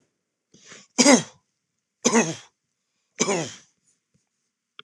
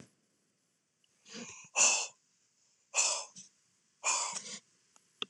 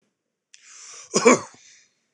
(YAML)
three_cough_length: 4.8 s
three_cough_amplitude: 25612
three_cough_signal_mean_std_ratio: 0.28
exhalation_length: 5.3 s
exhalation_amplitude: 8502
exhalation_signal_mean_std_ratio: 0.35
cough_length: 2.1 s
cough_amplitude: 25862
cough_signal_mean_std_ratio: 0.26
survey_phase: beta (2021-08-13 to 2022-03-07)
age: 45-64
gender: Male
wearing_mask: 'No'
symptom_none: true
smoker_status: Never smoked
respiratory_condition_asthma: false
respiratory_condition_other: false
recruitment_source: REACT
submission_delay: 2 days
covid_test_result: Negative
covid_test_method: RT-qPCR
influenza_a_test_result: Negative
influenza_b_test_result: Negative